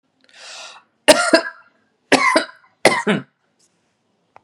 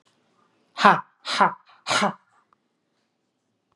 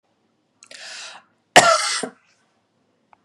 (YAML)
three_cough_length: 4.4 s
three_cough_amplitude: 32768
three_cough_signal_mean_std_ratio: 0.34
exhalation_length: 3.8 s
exhalation_amplitude: 32766
exhalation_signal_mean_std_ratio: 0.29
cough_length: 3.2 s
cough_amplitude: 32768
cough_signal_mean_std_ratio: 0.27
survey_phase: beta (2021-08-13 to 2022-03-07)
age: 45-64
gender: Female
wearing_mask: 'No'
symptom_runny_or_blocked_nose: true
symptom_fatigue: true
symptom_onset: 4 days
smoker_status: Current smoker (e-cigarettes or vapes only)
respiratory_condition_asthma: false
respiratory_condition_other: false
recruitment_source: REACT
submission_delay: 1 day
covid_test_result: Negative
covid_test_method: RT-qPCR
influenza_a_test_result: Negative
influenza_b_test_result: Negative